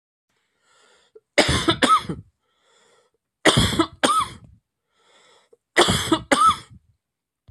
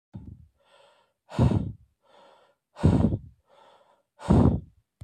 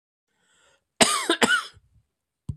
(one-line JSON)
{"three_cough_length": "7.5 s", "three_cough_amplitude": 28473, "three_cough_signal_mean_std_ratio": 0.4, "exhalation_length": "5.0 s", "exhalation_amplitude": 15418, "exhalation_signal_mean_std_ratio": 0.37, "cough_length": "2.6 s", "cough_amplitude": 28661, "cough_signal_mean_std_ratio": 0.34, "survey_phase": "beta (2021-08-13 to 2022-03-07)", "age": "45-64", "gender": "Male", "wearing_mask": "No", "symptom_cough_any": true, "symptom_runny_or_blocked_nose": true, "symptom_shortness_of_breath": true, "symptom_abdominal_pain": true, "symptom_fatigue": true, "symptom_loss_of_taste": true, "symptom_onset": "4 days", "smoker_status": "Ex-smoker", "respiratory_condition_asthma": false, "respiratory_condition_other": false, "recruitment_source": "Test and Trace", "submission_delay": "2 days", "covid_test_result": "Positive", "covid_test_method": "RT-qPCR", "covid_ct_value": 18.0, "covid_ct_gene": "ORF1ab gene", "covid_ct_mean": 18.6, "covid_viral_load": "810000 copies/ml", "covid_viral_load_category": "Low viral load (10K-1M copies/ml)"}